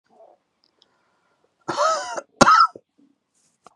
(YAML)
cough_length: 3.8 s
cough_amplitude: 32767
cough_signal_mean_std_ratio: 0.31
survey_phase: beta (2021-08-13 to 2022-03-07)
age: 45-64
gender: Male
wearing_mask: 'No'
symptom_cough_any: true
symptom_runny_or_blocked_nose: true
symptom_sore_throat: true
symptom_diarrhoea: true
symptom_fatigue: true
symptom_fever_high_temperature: true
symptom_headache: true
symptom_onset: 2 days
smoker_status: Never smoked
respiratory_condition_asthma: false
respiratory_condition_other: false
recruitment_source: Test and Trace
submission_delay: 2 days
covid_test_result: Positive
covid_test_method: RT-qPCR
covid_ct_value: 20.1
covid_ct_gene: ORF1ab gene
covid_ct_mean: 20.3
covid_viral_load: 220000 copies/ml
covid_viral_load_category: Low viral load (10K-1M copies/ml)